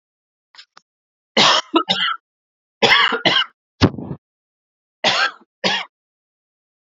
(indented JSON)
{
  "three_cough_length": "7.0 s",
  "three_cough_amplitude": 32767,
  "three_cough_signal_mean_std_ratio": 0.39,
  "survey_phase": "beta (2021-08-13 to 2022-03-07)",
  "age": "18-44",
  "gender": "Male",
  "wearing_mask": "No",
  "symptom_cough_any": true,
  "symptom_runny_or_blocked_nose": true,
  "symptom_fatigue": true,
  "symptom_headache": true,
  "smoker_status": "Never smoked",
  "respiratory_condition_asthma": false,
  "respiratory_condition_other": false,
  "recruitment_source": "Test and Trace",
  "submission_delay": "2 days",
  "covid_test_result": "Positive",
  "covid_test_method": "RT-qPCR",
  "covid_ct_value": 14.8,
  "covid_ct_gene": "ORF1ab gene"
}